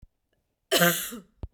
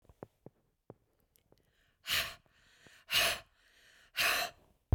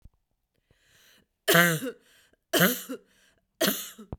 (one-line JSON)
{"cough_length": "1.5 s", "cough_amplitude": 18720, "cough_signal_mean_std_ratio": 0.38, "exhalation_length": "4.9 s", "exhalation_amplitude": 5515, "exhalation_signal_mean_std_ratio": 0.33, "three_cough_length": "4.2 s", "three_cough_amplitude": 21378, "three_cough_signal_mean_std_ratio": 0.35, "survey_phase": "beta (2021-08-13 to 2022-03-07)", "age": "45-64", "gender": "Female", "wearing_mask": "No", "symptom_none": true, "smoker_status": "Ex-smoker", "respiratory_condition_asthma": false, "respiratory_condition_other": false, "recruitment_source": "REACT", "submission_delay": "0 days", "covid_test_result": "Negative", "covid_test_method": "RT-qPCR", "influenza_a_test_result": "Negative", "influenza_b_test_result": "Negative"}